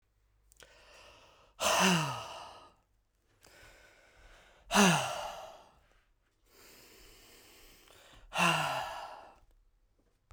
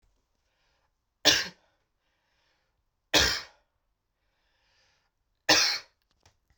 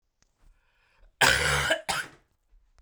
{
  "exhalation_length": "10.3 s",
  "exhalation_amplitude": 8964,
  "exhalation_signal_mean_std_ratio": 0.35,
  "three_cough_length": "6.6 s",
  "three_cough_amplitude": 15270,
  "three_cough_signal_mean_std_ratio": 0.26,
  "cough_length": "2.8 s",
  "cough_amplitude": 18765,
  "cough_signal_mean_std_ratio": 0.4,
  "survey_phase": "beta (2021-08-13 to 2022-03-07)",
  "age": "18-44",
  "gender": "Male",
  "wearing_mask": "Yes",
  "symptom_cough_any": true,
  "symptom_runny_or_blocked_nose": true,
  "symptom_fever_high_temperature": true,
  "symptom_headache": true,
  "symptom_other": true,
  "smoker_status": "Never smoked",
  "respiratory_condition_asthma": false,
  "respiratory_condition_other": false,
  "recruitment_source": "Test and Trace",
  "submission_delay": "2 days",
  "covid_test_result": "Positive",
  "covid_test_method": "RT-qPCR"
}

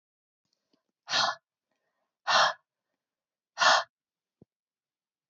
{
  "exhalation_length": "5.3 s",
  "exhalation_amplitude": 12262,
  "exhalation_signal_mean_std_ratio": 0.28,
  "survey_phase": "alpha (2021-03-01 to 2021-08-12)",
  "age": "65+",
  "gender": "Female",
  "wearing_mask": "No",
  "symptom_none": true,
  "symptom_onset": "9 days",
  "smoker_status": "Never smoked",
  "respiratory_condition_asthma": false,
  "respiratory_condition_other": false,
  "recruitment_source": "REACT",
  "submission_delay": "1 day",
  "covid_test_result": "Negative",
  "covid_test_method": "RT-qPCR"
}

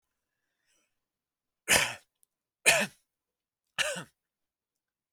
{
  "three_cough_length": "5.1 s",
  "three_cough_amplitude": 13650,
  "three_cough_signal_mean_std_ratio": 0.25,
  "survey_phase": "alpha (2021-03-01 to 2021-08-12)",
  "age": "18-44",
  "gender": "Male",
  "wearing_mask": "No",
  "symptom_none": true,
  "smoker_status": "Never smoked",
  "respiratory_condition_asthma": false,
  "respiratory_condition_other": false,
  "recruitment_source": "REACT",
  "submission_delay": "1 day",
  "covid_test_result": "Negative",
  "covid_test_method": "RT-qPCR"
}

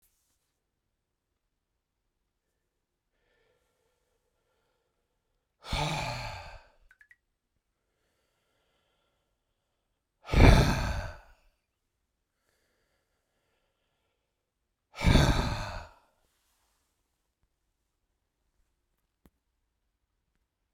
{
  "exhalation_length": "20.7 s",
  "exhalation_amplitude": 19048,
  "exhalation_signal_mean_std_ratio": 0.21,
  "survey_phase": "beta (2021-08-13 to 2022-03-07)",
  "age": "18-44",
  "gender": "Male",
  "wearing_mask": "No",
  "symptom_none": true,
  "smoker_status": "Never smoked",
  "respiratory_condition_asthma": false,
  "respiratory_condition_other": false,
  "recruitment_source": "Test and Trace",
  "submission_delay": "1 day",
  "covid_test_result": "Positive",
  "covid_test_method": "RT-qPCR",
  "covid_ct_value": 35.1,
  "covid_ct_gene": "ORF1ab gene"
}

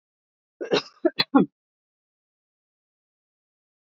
{
  "cough_length": "3.8 s",
  "cough_amplitude": 21369,
  "cough_signal_mean_std_ratio": 0.22,
  "survey_phase": "beta (2021-08-13 to 2022-03-07)",
  "age": "45-64",
  "gender": "Female",
  "wearing_mask": "No",
  "symptom_none": true,
  "smoker_status": "Never smoked",
  "respiratory_condition_asthma": false,
  "respiratory_condition_other": false,
  "recruitment_source": "REACT",
  "submission_delay": "2 days",
  "covid_test_result": "Negative",
  "covid_test_method": "RT-qPCR",
  "influenza_a_test_result": "Negative",
  "influenza_b_test_result": "Negative"
}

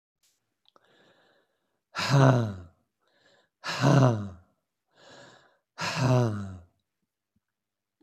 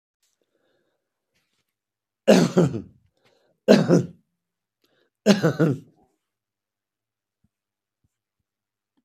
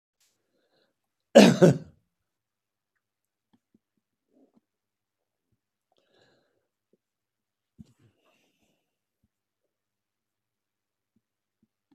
{
  "exhalation_length": "8.0 s",
  "exhalation_amplitude": 19176,
  "exhalation_signal_mean_std_ratio": 0.36,
  "three_cough_length": "9.0 s",
  "three_cough_amplitude": 31230,
  "three_cough_signal_mean_std_ratio": 0.27,
  "cough_length": "11.9 s",
  "cough_amplitude": 26803,
  "cough_signal_mean_std_ratio": 0.13,
  "survey_phase": "beta (2021-08-13 to 2022-03-07)",
  "age": "65+",
  "gender": "Male",
  "wearing_mask": "No",
  "symptom_none": true,
  "smoker_status": "Never smoked",
  "respiratory_condition_asthma": false,
  "respiratory_condition_other": false,
  "recruitment_source": "REACT",
  "submission_delay": "3 days",
  "covid_test_result": "Negative",
  "covid_test_method": "RT-qPCR",
  "influenza_a_test_result": "Negative",
  "influenza_b_test_result": "Negative"
}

